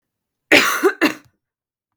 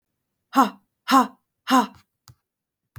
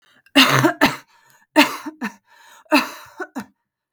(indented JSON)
{
  "cough_length": "2.0 s",
  "cough_amplitude": 32767,
  "cough_signal_mean_std_ratio": 0.38,
  "exhalation_length": "3.0 s",
  "exhalation_amplitude": 22901,
  "exhalation_signal_mean_std_ratio": 0.31,
  "three_cough_length": "3.9 s",
  "three_cough_amplitude": 32768,
  "three_cough_signal_mean_std_ratio": 0.38,
  "survey_phase": "beta (2021-08-13 to 2022-03-07)",
  "age": "18-44",
  "gender": "Female",
  "wearing_mask": "No",
  "symptom_runny_or_blocked_nose": true,
  "symptom_sore_throat": true,
  "symptom_diarrhoea": true,
  "symptom_fever_high_temperature": true,
  "symptom_onset": "3 days",
  "smoker_status": "Never smoked",
  "respiratory_condition_asthma": false,
  "respiratory_condition_other": false,
  "recruitment_source": "Test and Trace",
  "submission_delay": "1 day",
  "covid_test_result": "Positive",
  "covid_test_method": "RT-qPCR",
  "covid_ct_value": 14.9,
  "covid_ct_gene": "ORF1ab gene"
}